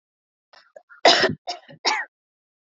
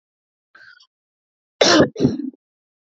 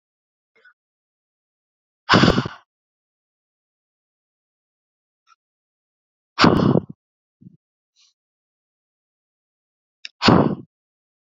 {"three_cough_length": "2.6 s", "three_cough_amplitude": 28501, "three_cough_signal_mean_std_ratio": 0.32, "cough_length": "3.0 s", "cough_amplitude": 27542, "cough_signal_mean_std_ratio": 0.32, "exhalation_length": "11.3 s", "exhalation_amplitude": 29190, "exhalation_signal_mean_std_ratio": 0.23, "survey_phase": "beta (2021-08-13 to 2022-03-07)", "age": "18-44", "gender": "Female", "wearing_mask": "No", "symptom_none": true, "symptom_onset": "7 days", "smoker_status": "Current smoker (1 to 10 cigarettes per day)", "respiratory_condition_asthma": false, "respiratory_condition_other": false, "recruitment_source": "REACT", "submission_delay": "1 day", "covid_test_result": "Negative", "covid_test_method": "RT-qPCR", "influenza_a_test_result": "Negative", "influenza_b_test_result": "Negative"}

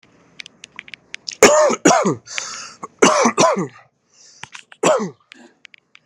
{"three_cough_length": "6.1 s", "three_cough_amplitude": 32768, "three_cough_signal_mean_std_ratio": 0.42, "survey_phase": "beta (2021-08-13 to 2022-03-07)", "age": "18-44", "gender": "Male", "wearing_mask": "No", "symptom_shortness_of_breath": true, "smoker_status": "Ex-smoker", "respiratory_condition_asthma": false, "respiratory_condition_other": false, "recruitment_source": "REACT", "submission_delay": "4 days", "covid_test_result": "Negative", "covid_test_method": "RT-qPCR"}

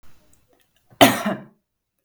{"cough_length": "2.0 s", "cough_amplitude": 32768, "cough_signal_mean_std_ratio": 0.27, "survey_phase": "beta (2021-08-13 to 2022-03-07)", "age": "18-44", "gender": "Female", "wearing_mask": "No", "symptom_none": true, "smoker_status": "Never smoked", "respiratory_condition_asthma": false, "respiratory_condition_other": false, "recruitment_source": "REACT", "submission_delay": "1 day", "covid_test_result": "Negative", "covid_test_method": "RT-qPCR"}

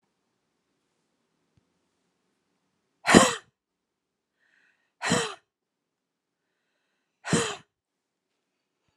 {"exhalation_length": "9.0 s", "exhalation_amplitude": 32768, "exhalation_signal_mean_std_ratio": 0.19, "survey_phase": "beta (2021-08-13 to 2022-03-07)", "age": "45-64", "gender": "Female", "wearing_mask": "No", "symptom_none": true, "smoker_status": "Never smoked", "respiratory_condition_asthma": false, "respiratory_condition_other": false, "recruitment_source": "REACT", "submission_delay": "1 day", "covid_test_result": "Negative", "covid_test_method": "RT-qPCR"}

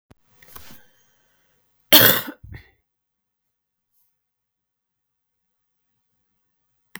{"cough_length": "7.0 s", "cough_amplitude": 32768, "cough_signal_mean_std_ratio": 0.17, "survey_phase": "beta (2021-08-13 to 2022-03-07)", "age": "45-64", "gender": "Female", "wearing_mask": "No", "symptom_cough_any": true, "symptom_new_continuous_cough": true, "symptom_runny_or_blocked_nose": true, "symptom_fatigue": true, "symptom_headache": true, "symptom_change_to_sense_of_smell_or_taste": true, "symptom_loss_of_taste": true, "symptom_onset": "5 days", "smoker_status": "Ex-smoker", "respiratory_condition_asthma": false, "respiratory_condition_other": false, "recruitment_source": "Test and Trace", "submission_delay": "1 day", "covid_test_result": "Positive", "covid_test_method": "RT-qPCR", "covid_ct_value": 15.8, "covid_ct_gene": "ORF1ab gene"}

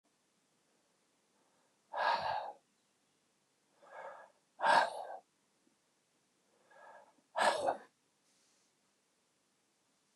{"exhalation_length": "10.2 s", "exhalation_amplitude": 5372, "exhalation_signal_mean_std_ratio": 0.29, "survey_phase": "beta (2021-08-13 to 2022-03-07)", "age": "65+", "gender": "Male", "wearing_mask": "No", "symptom_none": true, "smoker_status": "Ex-smoker", "respiratory_condition_asthma": false, "respiratory_condition_other": false, "recruitment_source": "REACT", "submission_delay": "1 day", "covid_test_result": "Negative", "covid_test_method": "RT-qPCR", "influenza_a_test_result": "Negative", "influenza_b_test_result": "Negative"}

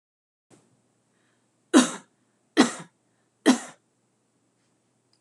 {"three_cough_length": "5.2 s", "three_cough_amplitude": 22259, "three_cough_signal_mean_std_ratio": 0.22, "survey_phase": "alpha (2021-03-01 to 2021-08-12)", "age": "45-64", "gender": "Female", "wearing_mask": "No", "symptom_none": true, "smoker_status": "Ex-smoker", "respiratory_condition_asthma": false, "respiratory_condition_other": false, "recruitment_source": "REACT", "submission_delay": "1 day", "covid_test_result": "Negative", "covid_test_method": "RT-qPCR"}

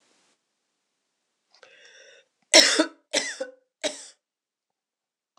{"three_cough_length": "5.4 s", "three_cough_amplitude": 26028, "three_cough_signal_mean_std_ratio": 0.23, "survey_phase": "alpha (2021-03-01 to 2021-08-12)", "age": "45-64", "gender": "Female", "wearing_mask": "No", "symptom_cough_any": true, "symptom_fatigue": true, "symptom_headache": true, "smoker_status": "Never smoked", "respiratory_condition_asthma": false, "respiratory_condition_other": false, "recruitment_source": "Test and Trace", "submission_delay": "1 day", "covid_test_result": "Positive", "covid_test_method": "RT-qPCR", "covid_ct_value": 19.0, "covid_ct_gene": "ORF1ab gene"}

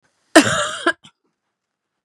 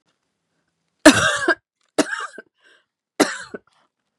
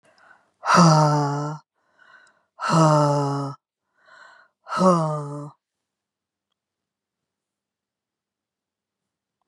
{"cough_length": "2.0 s", "cough_amplitude": 32768, "cough_signal_mean_std_ratio": 0.31, "three_cough_length": "4.2 s", "three_cough_amplitude": 32768, "three_cough_signal_mean_std_ratio": 0.28, "exhalation_length": "9.5 s", "exhalation_amplitude": 24001, "exhalation_signal_mean_std_ratio": 0.4, "survey_phase": "beta (2021-08-13 to 2022-03-07)", "age": "45-64", "gender": "Female", "wearing_mask": "No", "symptom_cough_any": true, "symptom_fatigue": true, "symptom_onset": "9 days", "smoker_status": "Never smoked", "respiratory_condition_asthma": false, "respiratory_condition_other": false, "recruitment_source": "Test and Trace", "submission_delay": "2 days", "covid_test_result": "Positive", "covid_test_method": "RT-qPCR", "covid_ct_value": 26.5, "covid_ct_gene": "ORF1ab gene", "covid_ct_mean": 26.8, "covid_viral_load": "1700 copies/ml", "covid_viral_load_category": "Minimal viral load (< 10K copies/ml)"}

